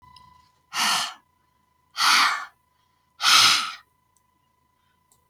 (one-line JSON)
{"exhalation_length": "5.3 s", "exhalation_amplitude": 23194, "exhalation_signal_mean_std_ratio": 0.39, "survey_phase": "beta (2021-08-13 to 2022-03-07)", "age": "65+", "gender": "Female", "wearing_mask": "No", "symptom_none": true, "smoker_status": "Never smoked", "respiratory_condition_asthma": false, "respiratory_condition_other": false, "recruitment_source": "REACT", "submission_delay": "1 day", "covid_test_result": "Negative", "covid_test_method": "RT-qPCR", "influenza_a_test_result": "Negative", "influenza_b_test_result": "Negative"}